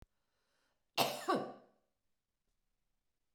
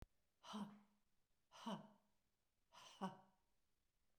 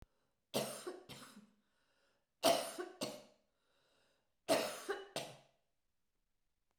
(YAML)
cough_length: 3.3 s
cough_amplitude: 4742
cough_signal_mean_std_ratio: 0.28
exhalation_length: 4.2 s
exhalation_amplitude: 507
exhalation_signal_mean_std_ratio: 0.38
three_cough_length: 6.8 s
three_cough_amplitude: 4677
three_cough_signal_mean_std_ratio: 0.34
survey_phase: beta (2021-08-13 to 2022-03-07)
age: 65+
gender: Female
wearing_mask: 'No'
symptom_none: true
smoker_status: Never smoked
respiratory_condition_asthma: false
respiratory_condition_other: false
recruitment_source: REACT
submission_delay: 2 days
covid_test_result: Negative
covid_test_method: RT-qPCR